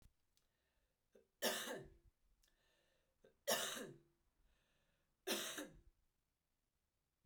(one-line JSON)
{"three_cough_length": "7.3 s", "three_cough_amplitude": 2029, "three_cough_signal_mean_std_ratio": 0.33, "survey_phase": "beta (2021-08-13 to 2022-03-07)", "age": "45-64", "gender": "Female", "wearing_mask": "No", "symptom_runny_or_blocked_nose": true, "symptom_change_to_sense_of_smell_or_taste": true, "symptom_loss_of_taste": true, "symptom_onset": "4 days", "smoker_status": "Never smoked", "respiratory_condition_asthma": false, "respiratory_condition_other": false, "recruitment_source": "Test and Trace", "submission_delay": "2 days", "covid_test_result": "Positive", "covid_test_method": "ePCR"}